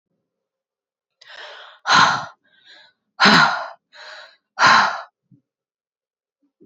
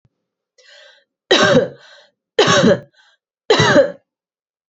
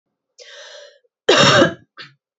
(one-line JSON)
{"exhalation_length": "6.7 s", "exhalation_amplitude": 30814, "exhalation_signal_mean_std_ratio": 0.34, "three_cough_length": "4.7 s", "three_cough_amplitude": 30321, "three_cough_signal_mean_std_ratio": 0.42, "cough_length": "2.4 s", "cough_amplitude": 30498, "cough_signal_mean_std_ratio": 0.38, "survey_phase": "beta (2021-08-13 to 2022-03-07)", "age": "45-64", "gender": "Female", "wearing_mask": "No", "symptom_runny_or_blocked_nose": true, "symptom_sore_throat": true, "symptom_headache": true, "symptom_onset": "2 days", "smoker_status": "Never smoked", "respiratory_condition_asthma": false, "respiratory_condition_other": false, "recruitment_source": "Test and Trace", "submission_delay": "1 day", "covid_test_result": "Positive", "covid_test_method": "RT-qPCR", "covid_ct_value": 20.1, "covid_ct_gene": "ORF1ab gene", "covid_ct_mean": 20.5, "covid_viral_load": "190000 copies/ml", "covid_viral_load_category": "Low viral load (10K-1M copies/ml)"}